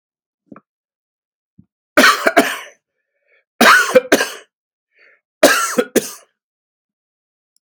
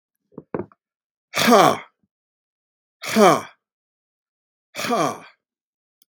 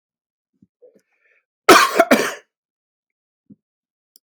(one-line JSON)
{"three_cough_length": "7.7 s", "three_cough_amplitude": 32768, "three_cough_signal_mean_std_ratio": 0.33, "exhalation_length": "6.1 s", "exhalation_amplitude": 32767, "exhalation_signal_mean_std_ratio": 0.31, "cough_length": "4.3 s", "cough_amplitude": 32768, "cough_signal_mean_std_ratio": 0.25, "survey_phase": "beta (2021-08-13 to 2022-03-07)", "age": "65+", "gender": "Male", "wearing_mask": "No", "symptom_none": true, "smoker_status": "Ex-smoker", "respiratory_condition_asthma": false, "respiratory_condition_other": false, "recruitment_source": "REACT", "submission_delay": "2 days", "covid_test_result": "Negative", "covid_test_method": "RT-qPCR", "influenza_a_test_result": "Negative", "influenza_b_test_result": "Negative"}